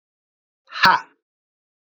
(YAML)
exhalation_length: 2.0 s
exhalation_amplitude: 28687
exhalation_signal_mean_std_ratio: 0.24
survey_phase: beta (2021-08-13 to 2022-03-07)
age: 18-44
gender: Male
wearing_mask: 'No'
symptom_none: true
smoker_status: Never smoked
respiratory_condition_asthma: false
respiratory_condition_other: false
recruitment_source: REACT
submission_delay: 1 day
covid_test_result: Negative
covid_test_method: RT-qPCR